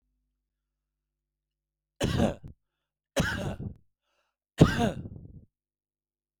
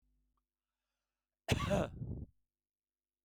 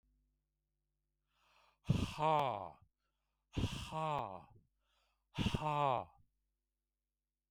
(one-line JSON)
{"three_cough_length": "6.4 s", "three_cough_amplitude": 20711, "three_cough_signal_mean_std_ratio": 0.29, "cough_length": "3.2 s", "cough_amplitude": 3975, "cough_signal_mean_std_ratio": 0.33, "exhalation_length": "7.5 s", "exhalation_amplitude": 3004, "exhalation_signal_mean_std_ratio": 0.38, "survey_phase": "beta (2021-08-13 to 2022-03-07)", "age": "65+", "gender": "Male", "wearing_mask": "No", "symptom_none": true, "smoker_status": "Never smoked", "respiratory_condition_asthma": false, "respiratory_condition_other": false, "recruitment_source": "REACT", "submission_delay": "3 days", "covid_test_result": "Negative", "covid_test_method": "RT-qPCR"}